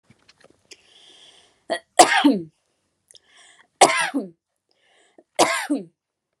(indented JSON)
{
  "three_cough_length": "6.4 s",
  "three_cough_amplitude": 32768,
  "three_cough_signal_mean_std_ratio": 0.3,
  "survey_phase": "beta (2021-08-13 to 2022-03-07)",
  "age": "18-44",
  "gender": "Female",
  "wearing_mask": "No",
  "symptom_none": true,
  "smoker_status": "Never smoked",
  "respiratory_condition_asthma": false,
  "respiratory_condition_other": false,
  "recruitment_source": "REACT",
  "submission_delay": "3 days",
  "covid_test_result": "Negative",
  "covid_test_method": "RT-qPCR"
}